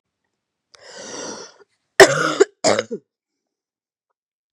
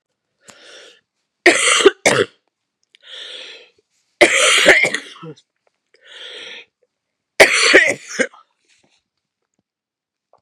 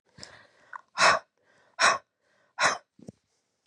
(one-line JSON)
{"cough_length": "4.5 s", "cough_amplitude": 32768, "cough_signal_mean_std_ratio": 0.26, "three_cough_length": "10.4 s", "three_cough_amplitude": 32768, "three_cough_signal_mean_std_ratio": 0.35, "exhalation_length": "3.7 s", "exhalation_amplitude": 17098, "exhalation_signal_mean_std_ratio": 0.31, "survey_phase": "beta (2021-08-13 to 2022-03-07)", "age": "45-64", "gender": "Female", "wearing_mask": "No", "symptom_cough_any": true, "symptom_runny_or_blocked_nose": true, "symptom_shortness_of_breath": true, "symptom_headache": true, "symptom_onset": "3 days", "smoker_status": "Ex-smoker", "respiratory_condition_asthma": false, "respiratory_condition_other": false, "recruitment_source": "Test and Trace", "submission_delay": "2 days", "covid_test_result": "Positive", "covid_test_method": "RT-qPCR", "covid_ct_value": 20.3, "covid_ct_gene": "ORF1ab gene", "covid_ct_mean": 21.2, "covid_viral_load": "110000 copies/ml", "covid_viral_load_category": "Low viral load (10K-1M copies/ml)"}